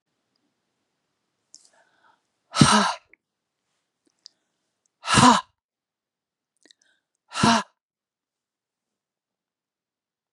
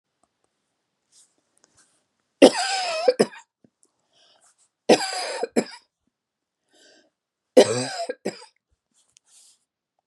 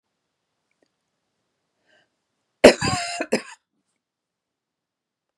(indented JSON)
{
  "exhalation_length": "10.3 s",
  "exhalation_amplitude": 30955,
  "exhalation_signal_mean_std_ratio": 0.22,
  "three_cough_length": "10.1 s",
  "three_cough_amplitude": 32768,
  "three_cough_signal_mean_std_ratio": 0.25,
  "cough_length": "5.4 s",
  "cough_amplitude": 32768,
  "cough_signal_mean_std_ratio": 0.18,
  "survey_phase": "beta (2021-08-13 to 2022-03-07)",
  "age": "65+",
  "gender": "Female",
  "wearing_mask": "No",
  "symptom_runny_or_blocked_nose": true,
  "symptom_onset": "12 days",
  "smoker_status": "Ex-smoker",
  "respiratory_condition_asthma": false,
  "respiratory_condition_other": false,
  "recruitment_source": "REACT",
  "submission_delay": "1 day",
  "covid_test_result": "Negative",
  "covid_test_method": "RT-qPCR"
}